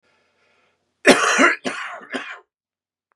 {
  "cough_length": "3.2 s",
  "cough_amplitude": 32767,
  "cough_signal_mean_std_ratio": 0.36,
  "survey_phase": "beta (2021-08-13 to 2022-03-07)",
  "age": "45-64",
  "gender": "Male",
  "wearing_mask": "No",
  "symptom_cough_any": true,
  "symptom_onset": "12 days",
  "smoker_status": "Current smoker (1 to 10 cigarettes per day)",
  "respiratory_condition_asthma": false,
  "respiratory_condition_other": false,
  "recruitment_source": "REACT",
  "submission_delay": "1 day",
  "covid_test_result": "Negative",
  "covid_test_method": "RT-qPCR",
  "influenza_a_test_result": "Negative",
  "influenza_b_test_result": "Negative"
}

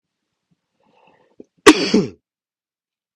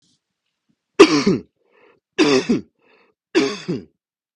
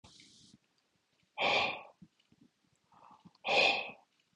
{
  "cough_length": "3.2 s",
  "cough_amplitude": 32768,
  "cough_signal_mean_std_ratio": 0.22,
  "three_cough_length": "4.4 s",
  "three_cough_amplitude": 32768,
  "three_cough_signal_mean_std_ratio": 0.35,
  "exhalation_length": "4.4 s",
  "exhalation_amplitude": 5581,
  "exhalation_signal_mean_std_ratio": 0.36,
  "survey_phase": "beta (2021-08-13 to 2022-03-07)",
  "age": "18-44",
  "gender": "Male",
  "wearing_mask": "No",
  "symptom_runny_or_blocked_nose": true,
  "smoker_status": "Never smoked",
  "respiratory_condition_asthma": false,
  "respiratory_condition_other": false,
  "recruitment_source": "REACT",
  "submission_delay": "1 day",
  "covid_test_result": "Negative",
  "covid_test_method": "RT-qPCR",
  "influenza_a_test_result": "Negative",
  "influenza_b_test_result": "Negative"
}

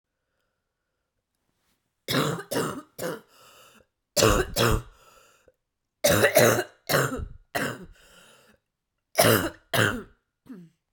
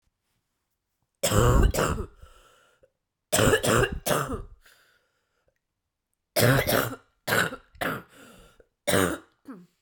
{
  "cough_length": "10.9 s",
  "cough_amplitude": 19299,
  "cough_signal_mean_std_ratio": 0.4,
  "three_cough_length": "9.8 s",
  "three_cough_amplitude": 18298,
  "three_cough_signal_mean_std_ratio": 0.43,
  "survey_phase": "beta (2021-08-13 to 2022-03-07)",
  "age": "18-44",
  "gender": "Female",
  "wearing_mask": "No",
  "symptom_cough_any": true,
  "symptom_runny_or_blocked_nose": true,
  "symptom_onset": "8 days",
  "smoker_status": "Never smoked",
  "respiratory_condition_asthma": true,
  "respiratory_condition_other": false,
  "recruitment_source": "REACT",
  "submission_delay": "1 day",
  "covid_test_result": "Negative",
  "covid_test_method": "RT-qPCR"
}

